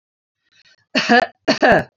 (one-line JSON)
{"cough_length": "2.0 s", "cough_amplitude": 28098, "cough_signal_mean_std_ratio": 0.44, "survey_phase": "beta (2021-08-13 to 2022-03-07)", "age": "65+", "gender": "Female", "wearing_mask": "No", "symptom_none": true, "smoker_status": "Never smoked", "respiratory_condition_asthma": false, "respiratory_condition_other": false, "recruitment_source": "REACT", "submission_delay": "1 day", "covid_test_result": "Negative", "covid_test_method": "RT-qPCR", "influenza_a_test_result": "Unknown/Void", "influenza_b_test_result": "Unknown/Void"}